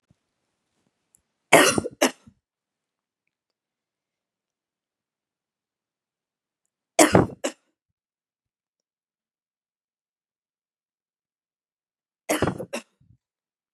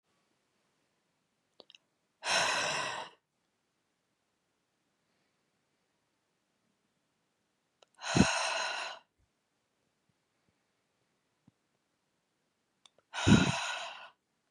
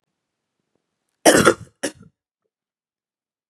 {"three_cough_length": "13.7 s", "three_cough_amplitude": 32411, "three_cough_signal_mean_std_ratio": 0.18, "exhalation_length": "14.5 s", "exhalation_amplitude": 11154, "exhalation_signal_mean_std_ratio": 0.27, "cough_length": "3.5 s", "cough_amplitude": 32767, "cough_signal_mean_std_ratio": 0.23, "survey_phase": "beta (2021-08-13 to 2022-03-07)", "age": "18-44", "gender": "Female", "wearing_mask": "No", "symptom_cough_any": true, "symptom_shortness_of_breath": true, "symptom_sore_throat": true, "symptom_fatigue": true, "symptom_fever_high_temperature": true, "symptom_headache": true, "symptom_other": true, "smoker_status": "Never smoked", "respiratory_condition_asthma": false, "respiratory_condition_other": false, "recruitment_source": "Test and Trace", "submission_delay": "2 days", "covid_test_result": "Positive", "covid_test_method": "RT-qPCR", "covid_ct_value": 25.8, "covid_ct_gene": "N gene"}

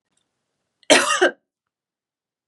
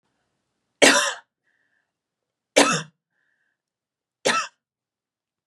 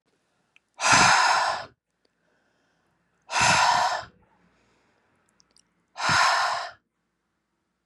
{"cough_length": "2.5 s", "cough_amplitude": 32768, "cough_signal_mean_std_ratio": 0.29, "three_cough_length": "5.5 s", "three_cough_amplitude": 31641, "three_cough_signal_mean_std_ratio": 0.26, "exhalation_length": "7.9 s", "exhalation_amplitude": 20505, "exhalation_signal_mean_std_ratio": 0.43, "survey_phase": "beta (2021-08-13 to 2022-03-07)", "age": "18-44", "gender": "Female", "wearing_mask": "No", "symptom_cough_any": true, "symptom_sore_throat": true, "symptom_fatigue": true, "symptom_onset": "3 days", "smoker_status": "Never smoked", "respiratory_condition_asthma": false, "respiratory_condition_other": false, "recruitment_source": "Test and Trace", "submission_delay": "2 days", "covid_test_result": "Positive", "covid_test_method": "RT-qPCR", "covid_ct_value": 24.8, "covid_ct_gene": "ORF1ab gene", "covid_ct_mean": 25.0, "covid_viral_load": "6400 copies/ml", "covid_viral_load_category": "Minimal viral load (< 10K copies/ml)"}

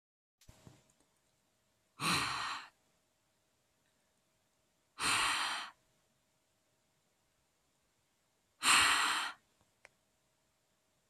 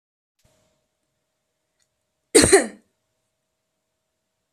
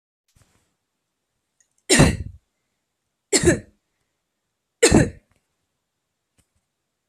{"exhalation_length": "11.1 s", "exhalation_amplitude": 7795, "exhalation_signal_mean_std_ratio": 0.32, "cough_length": "4.5 s", "cough_amplitude": 32767, "cough_signal_mean_std_ratio": 0.19, "three_cough_length": "7.1 s", "three_cough_amplitude": 25470, "three_cough_signal_mean_std_ratio": 0.25, "survey_phase": "beta (2021-08-13 to 2022-03-07)", "age": "18-44", "gender": "Female", "wearing_mask": "No", "symptom_runny_or_blocked_nose": true, "symptom_shortness_of_breath": true, "symptom_fatigue": true, "symptom_change_to_sense_of_smell_or_taste": true, "symptom_other": true, "symptom_onset": "3 days", "smoker_status": "Never smoked", "respiratory_condition_asthma": false, "respiratory_condition_other": false, "recruitment_source": "Test and Trace", "submission_delay": "2 days", "covid_test_result": "Positive", "covid_test_method": "RT-qPCR", "covid_ct_value": 22.2, "covid_ct_gene": "ORF1ab gene", "covid_ct_mean": 22.5, "covid_viral_load": "41000 copies/ml", "covid_viral_load_category": "Low viral load (10K-1M copies/ml)"}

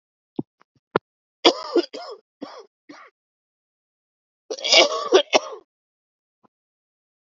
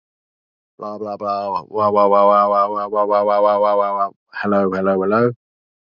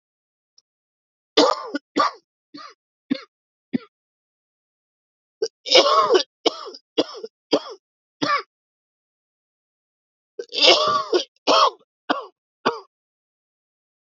{"cough_length": "7.3 s", "cough_amplitude": 32065, "cough_signal_mean_std_ratio": 0.26, "exhalation_length": "6.0 s", "exhalation_amplitude": 26844, "exhalation_signal_mean_std_ratio": 0.72, "three_cough_length": "14.1 s", "three_cough_amplitude": 32767, "three_cough_signal_mean_std_ratio": 0.33, "survey_phase": "beta (2021-08-13 to 2022-03-07)", "age": "18-44", "gender": "Male", "wearing_mask": "No", "symptom_cough_any": true, "symptom_runny_or_blocked_nose": true, "symptom_sore_throat": true, "symptom_abdominal_pain": true, "symptom_headache": true, "symptom_change_to_sense_of_smell_or_taste": true, "symptom_onset": "4 days", "smoker_status": "Never smoked", "respiratory_condition_asthma": false, "respiratory_condition_other": false, "recruitment_source": "Test and Trace", "submission_delay": "2 days", "covid_test_result": "Positive", "covid_test_method": "RT-qPCR"}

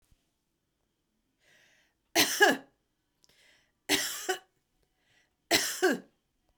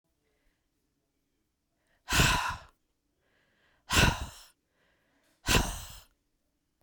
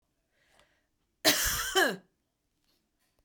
{"three_cough_length": "6.6 s", "three_cough_amplitude": 11183, "three_cough_signal_mean_std_ratio": 0.31, "exhalation_length": "6.8 s", "exhalation_amplitude": 10912, "exhalation_signal_mean_std_ratio": 0.31, "cough_length": "3.2 s", "cough_amplitude": 11346, "cough_signal_mean_std_ratio": 0.34, "survey_phase": "beta (2021-08-13 to 2022-03-07)", "age": "45-64", "gender": "Female", "wearing_mask": "No", "symptom_runny_or_blocked_nose": true, "symptom_sore_throat": true, "symptom_fatigue": true, "symptom_fever_high_temperature": true, "symptom_headache": true, "symptom_onset": "5 days", "smoker_status": "Never smoked", "respiratory_condition_asthma": false, "respiratory_condition_other": false, "recruitment_source": "Test and Trace", "submission_delay": "2 days", "covid_test_result": "Positive", "covid_test_method": "RT-qPCR", "covid_ct_value": 21.9, "covid_ct_gene": "ORF1ab gene", "covid_ct_mean": 22.0, "covid_viral_load": "60000 copies/ml", "covid_viral_load_category": "Low viral load (10K-1M copies/ml)"}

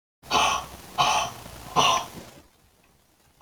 {"exhalation_length": "3.4 s", "exhalation_amplitude": 15205, "exhalation_signal_mean_std_ratio": 0.49, "survey_phase": "beta (2021-08-13 to 2022-03-07)", "age": "45-64", "gender": "Female", "wearing_mask": "No", "symptom_none": true, "smoker_status": "Prefer not to say", "respiratory_condition_asthma": false, "respiratory_condition_other": false, "recruitment_source": "REACT", "submission_delay": "5 days", "covid_test_result": "Negative", "covid_test_method": "RT-qPCR", "influenza_a_test_result": "Unknown/Void", "influenza_b_test_result": "Unknown/Void"}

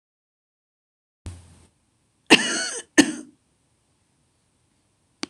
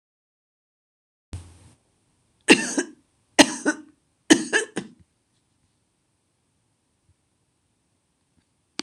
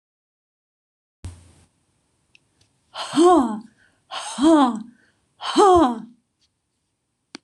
{"cough_length": "5.3 s", "cough_amplitude": 26028, "cough_signal_mean_std_ratio": 0.21, "three_cough_length": "8.8 s", "three_cough_amplitude": 26028, "three_cough_signal_mean_std_ratio": 0.2, "exhalation_length": "7.4 s", "exhalation_amplitude": 20676, "exhalation_signal_mean_std_ratio": 0.36, "survey_phase": "beta (2021-08-13 to 2022-03-07)", "age": "45-64", "gender": "Female", "wearing_mask": "Yes", "symptom_none": true, "smoker_status": "Never smoked", "respiratory_condition_asthma": false, "respiratory_condition_other": false, "recruitment_source": "REACT", "submission_delay": "1 day", "covid_test_result": "Negative", "covid_test_method": "RT-qPCR", "influenza_a_test_result": "Unknown/Void", "influenza_b_test_result": "Unknown/Void"}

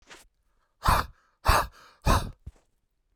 {"exhalation_length": "3.2 s", "exhalation_amplitude": 16242, "exhalation_signal_mean_std_ratio": 0.35, "survey_phase": "beta (2021-08-13 to 2022-03-07)", "age": "18-44", "gender": "Male", "wearing_mask": "No", "symptom_runny_or_blocked_nose": true, "symptom_onset": "8 days", "smoker_status": "Current smoker (11 or more cigarettes per day)", "respiratory_condition_asthma": true, "respiratory_condition_other": false, "recruitment_source": "REACT", "submission_delay": "0 days", "covid_test_result": "Negative", "covid_test_method": "RT-qPCR"}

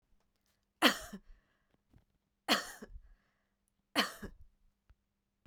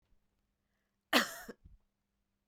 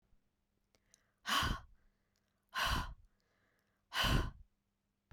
{"three_cough_length": "5.5 s", "three_cough_amplitude": 9511, "three_cough_signal_mean_std_ratio": 0.24, "cough_length": "2.5 s", "cough_amplitude": 7909, "cough_signal_mean_std_ratio": 0.21, "exhalation_length": "5.1 s", "exhalation_amplitude": 3119, "exhalation_signal_mean_std_ratio": 0.38, "survey_phase": "beta (2021-08-13 to 2022-03-07)", "age": "45-64", "gender": "Female", "wearing_mask": "No", "symptom_none": true, "smoker_status": "Never smoked", "respiratory_condition_asthma": false, "respiratory_condition_other": false, "recruitment_source": "REACT", "submission_delay": "2 days", "covid_test_result": "Negative", "covid_test_method": "RT-qPCR"}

